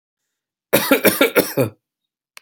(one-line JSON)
{"cough_length": "2.4 s", "cough_amplitude": 32767, "cough_signal_mean_std_ratio": 0.41, "survey_phase": "alpha (2021-03-01 to 2021-08-12)", "age": "18-44", "gender": "Male", "wearing_mask": "No", "symptom_none": true, "smoker_status": "Never smoked", "respiratory_condition_asthma": false, "respiratory_condition_other": false, "recruitment_source": "REACT", "submission_delay": "6 days", "covid_test_result": "Negative", "covid_test_method": "RT-qPCR"}